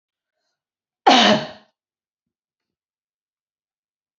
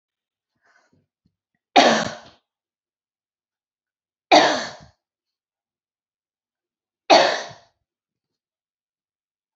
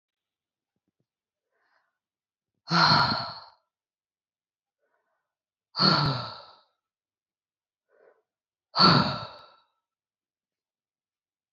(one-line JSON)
{"cough_length": "4.2 s", "cough_amplitude": 28578, "cough_signal_mean_std_ratio": 0.23, "three_cough_length": "9.6 s", "three_cough_amplitude": 32767, "three_cough_signal_mean_std_ratio": 0.23, "exhalation_length": "11.5 s", "exhalation_amplitude": 17480, "exhalation_signal_mean_std_ratio": 0.28, "survey_phase": "beta (2021-08-13 to 2022-03-07)", "age": "45-64", "gender": "Female", "wearing_mask": "No", "symptom_cough_any": true, "symptom_runny_or_blocked_nose": true, "smoker_status": "Never smoked", "respiratory_condition_asthma": false, "respiratory_condition_other": false, "recruitment_source": "Test and Trace", "submission_delay": "2 days", "covid_test_result": "Positive", "covid_test_method": "RT-qPCR", "covid_ct_value": 24.2, "covid_ct_gene": "ORF1ab gene", "covid_ct_mean": 24.6, "covid_viral_load": "8700 copies/ml", "covid_viral_load_category": "Minimal viral load (< 10K copies/ml)"}